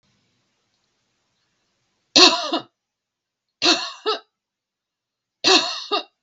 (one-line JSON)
{"three_cough_length": "6.2 s", "three_cough_amplitude": 32768, "three_cough_signal_mean_std_ratio": 0.3, "survey_phase": "beta (2021-08-13 to 2022-03-07)", "age": "65+", "gender": "Female", "wearing_mask": "No", "symptom_none": true, "smoker_status": "Ex-smoker", "respiratory_condition_asthma": false, "respiratory_condition_other": false, "recruitment_source": "REACT", "submission_delay": "1 day", "covid_test_result": "Negative", "covid_test_method": "RT-qPCR"}